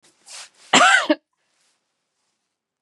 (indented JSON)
{
  "cough_length": "2.8 s",
  "cough_amplitude": 30557,
  "cough_signal_mean_std_ratio": 0.3,
  "survey_phase": "beta (2021-08-13 to 2022-03-07)",
  "age": "65+",
  "gender": "Female",
  "wearing_mask": "No",
  "symptom_runny_or_blocked_nose": true,
  "smoker_status": "Never smoked",
  "respiratory_condition_asthma": false,
  "respiratory_condition_other": false,
  "recruitment_source": "REACT",
  "submission_delay": "1 day",
  "covid_test_result": "Negative",
  "covid_test_method": "RT-qPCR"
}